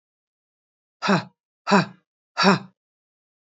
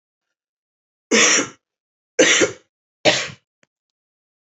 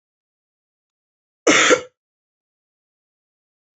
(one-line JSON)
{"exhalation_length": "3.4 s", "exhalation_amplitude": 27060, "exhalation_signal_mean_std_ratio": 0.31, "three_cough_length": "4.4 s", "three_cough_amplitude": 29619, "three_cough_signal_mean_std_ratio": 0.35, "cough_length": "3.8 s", "cough_amplitude": 27747, "cough_signal_mean_std_ratio": 0.23, "survey_phase": "beta (2021-08-13 to 2022-03-07)", "age": "18-44", "gender": "Female", "wearing_mask": "No", "symptom_cough_any": true, "symptom_runny_or_blocked_nose": true, "symptom_onset": "6 days", "smoker_status": "Never smoked", "respiratory_condition_asthma": false, "respiratory_condition_other": false, "recruitment_source": "Test and Trace", "submission_delay": "2 days", "covid_test_result": "Positive", "covid_test_method": "RT-qPCR", "covid_ct_value": 33.9, "covid_ct_gene": "ORF1ab gene"}